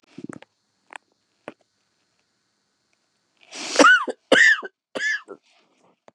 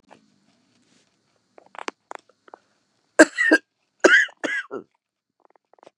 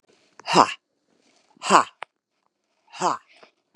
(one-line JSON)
{"three_cough_length": "6.1 s", "three_cough_amplitude": 32528, "three_cough_signal_mean_std_ratio": 0.29, "cough_length": "6.0 s", "cough_amplitude": 32767, "cough_signal_mean_std_ratio": 0.24, "exhalation_length": "3.8 s", "exhalation_amplitude": 32762, "exhalation_signal_mean_std_ratio": 0.25, "survey_phase": "beta (2021-08-13 to 2022-03-07)", "age": "45-64", "gender": "Female", "wearing_mask": "No", "symptom_cough_any": true, "symptom_runny_or_blocked_nose": true, "symptom_sore_throat": true, "smoker_status": "Never smoked", "respiratory_condition_asthma": false, "respiratory_condition_other": false, "recruitment_source": "Test and Trace", "submission_delay": "2 days", "covid_test_result": "Positive", "covid_test_method": "LFT"}